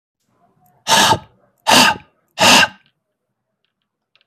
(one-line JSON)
{"exhalation_length": "4.3 s", "exhalation_amplitude": 32768, "exhalation_signal_mean_std_ratio": 0.37, "survey_phase": "beta (2021-08-13 to 2022-03-07)", "age": "45-64", "gender": "Male", "wearing_mask": "No", "symptom_none": true, "smoker_status": "Never smoked", "respiratory_condition_asthma": false, "respiratory_condition_other": false, "recruitment_source": "REACT", "submission_delay": "15 days", "covid_test_result": "Negative", "covid_test_method": "RT-qPCR", "influenza_a_test_result": "Negative", "influenza_b_test_result": "Negative"}